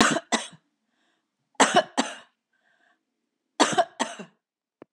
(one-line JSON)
{"three_cough_length": "4.9 s", "three_cough_amplitude": 23695, "three_cough_signal_mean_std_ratio": 0.32, "survey_phase": "beta (2021-08-13 to 2022-03-07)", "age": "65+", "gender": "Female", "wearing_mask": "No", "symptom_none": true, "symptom_onset": "12 days", "smoker_status": "Never smoked", "respiratory_condition_asthma": false, "respiratory_condition_other": false, "recruitment_source": "REACT", "submission_delay": "2 days", "covid_test_result": "Negative", "covid_test_method": "RT-qPCR", "influenza_a_test_result": "Negative", "influenza_b_test_result": "Negative"}